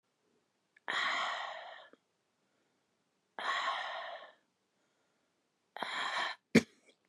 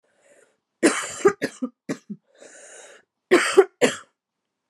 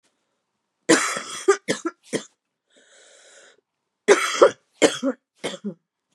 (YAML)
exhalation_length: 7.1 s
exhalation_amplitude: 8451
exhalation_signal_mean_std_ratio: 0.38
cough_length: 4.7 s
cough_amplitude: 26862
cough_signal_mean_std_ratio: 0.32
three_cough_length: 6.1 s
three_cough_amplitude: 31311
three_cough_signal_mean_std_ratio: 0.32
survey_phase: beta (2021-08-13 to 2022-03-07)
age: 18-44
gender: Female
wearing_mask: 'No'
symptom_cough_any: true
symptom_runny_or_blocked_nose: true
symptom_sore_throat: true
symptom_change_to_sense_of_smell_or_taste: true
symptom_onset: 4 days
smoker_status: Ex-smoker
respiratory_condition_asthma: false
respiratory_condition_other: false
recruitment_source: Test and Trace
submission_delay: 1 day
covid_test_result: Positive
covid_test_method: RT-qPCR
covid_ct_value: 21.9
covid_ct_gene: N gene